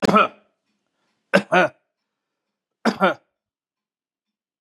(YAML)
three_cough_length: 4.6 s
three_cough_amplitude: 31078
three_cough_signal_mean_std_ratio: 0.29
survey_phase: beta (2021-08-13 to 2022-03-07)
age: 65+
gender: Male
wearing_mask: 'No'
symptom_none: true
smoker_status: Never smoked
respiratory_condition_asthma: false
respiratory_condition_other: false
recruitment_source: REACT
submission_delay: 2 days
covid_test_result: Negative
covid_test_method: RT-qPCR
influenza_a_test_result: Negative
influenza_b_test_result: Negative